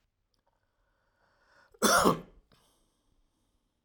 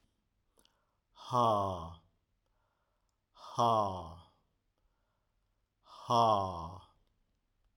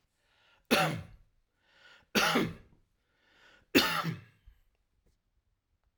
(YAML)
cough_length: 3.8 s
cough_amplitude: 10545
cough_signal_mean_std_ratio: 0.25
exhalation_length: 7.8 s
exhalation_amplitude: 5452
exhalation_signal_mean_std_ratio: 0.36
three_cough_length: 6.0 s
three_cough_amplitude: 9763
three_cough_signal_mean_std_ratio: 0.33
survey_phase: alpha (2021-03-01 to 2021-08-12)
age: 65+
gender: Male
wearing_mask: 'No'
symptom_none: true
smoker_status: Never smoked
respiratory_condition_asthma: false
respiratory_condition_other: false
recruitment_source: REACT
submission_delay: 2 days
covid_test_result: Negative
covid_test_method: RT-qPCR